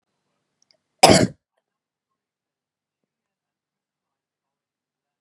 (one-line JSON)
{"cough_length": "5.2 s", "cough_amplitude": 32768, "cough_signal_mean_std_ratio": 0.16, "survey_phase": "beta (2021-08-13 to 2022-03-07)", "age": "18-44", "gender": "Female", "wearing_mask": "No", "symptom_none": true, "smoker_status": "Never smoked", "respiratory_condition_asthma": false, "respiratory_condition_other": false, "recruitment_source": "REACT", "submission_delay": "2 days", "covid_test_result": "Negative", "covid_test_method": "RT-qPCR", "influenza_a_test_result": "Negative", "influenza_b_test_result": "Negative"}